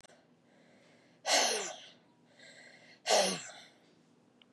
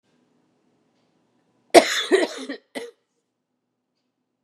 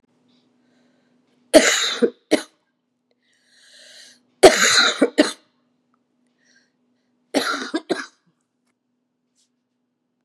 {"exhalation_length": "4.5 s", "exhalation_amplitude": 5795, "exhalation_signal_mean_std_ratio": 0.36, "cough_length": "4.4 s", "cough_amplitude": 32768, "cough_signal_mean_std_ratio": 0.23, "three_cough_length": "10.2 s", "three_cough_amplitude": 32768, "three_cough_signal_mean_std_ratio": 0.28, "survey_phase": "beta (2021-08-13 to 2022-03-07)", "age": "45-64", "gender": "Female", "wearing_mask": "No", "symptom_cough_any": true, "symptom_runny_or_blocked_nose": true, "symptom_fatigue": true, "symptom_change_to_sense_of_smell_or_taste": true, "symptom_loss_of_taste": true, "symptom_other": true, "smoker_status": "Never smoked", "respiratory_condition_asthma": false, "respiratory_condition_other": false, "recruitment_source": "Test and Trace", "submission_delay": "2 days", "covid_test_result": "Positive", "covid_test_method": "RT-qPCR", "covid_ct_value": 16.4, "covid_ct_gene": "ORF1ab gene", "covid_ct_mean": 17.5, "covid_viral_load": "1800000 copies/ml", "covid_viral_load_category": "High viral load (>1M copies/ml)"}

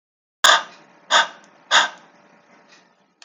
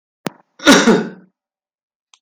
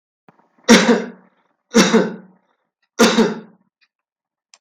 {"exhalation_length": "3.2 s", "exhalation_amplitude": 32768, "exhalation_signal_mean_std_ratio": 0.31, "cough_length": "2.2 s", "cough_amplitude": 32768, "cough_signal_mean_std_ratio": 0.35, "three_cough_length": "4.6 s", "three_cough_amplitude": 32768, "three_cough_signal_mean_std_ratio": 0.38, "survey_phase": "beta (2021-08-13 to 2022-03-07)", "age": "45-64", "gender": "Male", "wearing_mask": "No", "symptom_none": true, "smoker_status": "Ex-smoker", "respiratory_condition_asthma": false, "respiratory_condition_other": false, "recruitment_source": "REACT", "submission_delay": "1 day", "covid_test_result": "Negative", "covid_test_method": "RT-qPCR", "influenza_a_test_result": "Negative", "influenza_b_test_result": "Negative"}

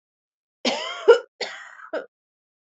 {"cough_length": "2.7 s", "cough_amplitude": 26171, "cough_signal_mean_std_ratio": 0.29, "survey_phase": "beta (2021-08-13 to 2022-03-07)", "age": "45-64", "gender": "Female", "wearing_mask": "No", "symptom_cough_any": true, "symptom_runny_or_blocked_nose": true, "symptom_fatigue": true, "symptom_onset": "5 days", "smoker_status": "Never smoked", "respiratory_condition_asthma": false, "respiratory_condition_other": false, "recruitment_source": "Test and Trace", "submission_delay": "1 day", "covid_test_result": "Positive", "covid_test_method": "RT-qPCR", "covid_ct_value": 17.0, "covid_ct_gene": "N gene", "covid_ct_mean": 18.0, "covid_viral_load": "1300000 copies/ml", "covid_viral_load_category": "High viral load (>1M copies/ml)"}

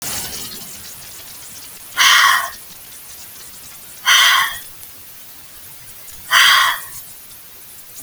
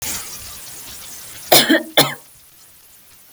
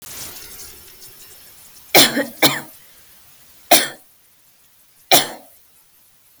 {"exhalation_length": "8.0 s", "exhalation_amplitude": 32768, "exhalation_signal_mean_std_ratio": 0.48, "cough_length": "3.3 s", "cough_amplitude": 32768, "cough_signal_mean_std_ratio": 0.39, "three_cough_length": "6.4 s", "three_cough_amplitude": 32768, "three_cough_signal_mean_std_ratio": 0.3, "survey_phase": "beta (2021-08-13 to 2022-03-07)", "age": "45-64", "gender": "Female", "wearing_mask": "No", "symptom_none": true, "symptom_onset": "7 days", "smoker_status": "Never smoked", "respiratory_condition_asthma": false, "respiratory_condition_other": false, "recruitment_source": "REACT", "submission_delay": "2 days", "covid_test_result": "Negative", "covid_test_method": "RT-qPCR", "influenza_a_test_result": "Negative", "influenza_b_test_result": "Negative"}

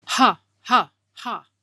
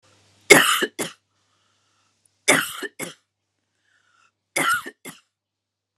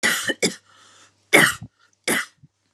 {"exhalation_length": "1.6 s", "exhalation_amplitude": 30144, "exhalation_signal_mean_std_ratio": 0.39, "three_cough_length": "6.0 s", "three_cough_amplitude": 32768, "three_cough_signal_mean_std_ratio": 0.28, "cough_length": "2.7 s", "cough_amplitude": 32111, "cough_signal_mean_std_ratio": 0.39, "survey_phase": "alpha (2021-03-01 to 2021-08-12)", "age": "45-64", "gender": "Female", "wearing_mask": "No", "symptom_none": true, "smoker_status": "Never smoked", "respiratory_condition_asthma": false, "respiratory_condition_other": false, "recruitment_source": "Test and Trace", "submission_delay": "0 days", "covid_test_result": "Negative", "covid_test_method": "LFT"}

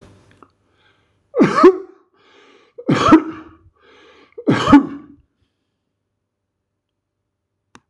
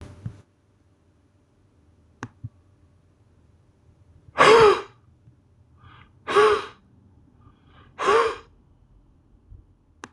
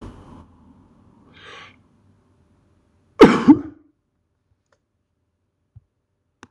{"three_cough_length": "7.9 s", "three_cough_amplitude": 26028, "three_cough_signal_mean_std_ratio": 0.3, "exhalation_length": "10.1 s", "exhalation_amplitude": 25732, "exhalation_signal_mean_std_ratio": 0.28, "cough_length": "6.5 s", "cough_amplitude": 26028, "cough_signal_mean_std_ratio": 0.18, "survey_phase": "beta (2021-08-13 to 2022-03-07)", "age": "65+", "gender": "Male", "wearing_mask": "No", "symptom_none": true, "smoker_status": "Never smoked", "respiratory_condition_asthma": false, "respiratory_condition_other": false, "recruitment_source": "REACT", "submission_delay": "3 days", "covid_test_result": "Negative", "covid_test_method": "RT-qPCR"}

